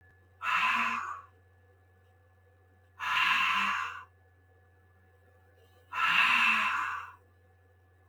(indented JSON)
{
  "exhalation_length": "8.1 s",
  "exhalation_amplitude": 8971,
  "exhalation_signal_mean_std_ratio": 0.51,
  "survey_phase": "beta (2021-08-13 to 2022-03-07)",
  "age": "18-44",
  "gender": "Male",
  "wearing_mask": "No",
  "symptom_none": true,
  "smoker_status": "Never smoked",
  "respiratory_condition_asthma": false,
  "respiratory_condition_other": false,
  "recruitment_source": "REACT",
  "submission_delay": "0 days",
  "covid_test_result": "Negative",
  "covid_test_method": "RT-qPCR",
  "influenza_a_test_result": "Negative",
  "influenza_b_test_result": "Negative"
}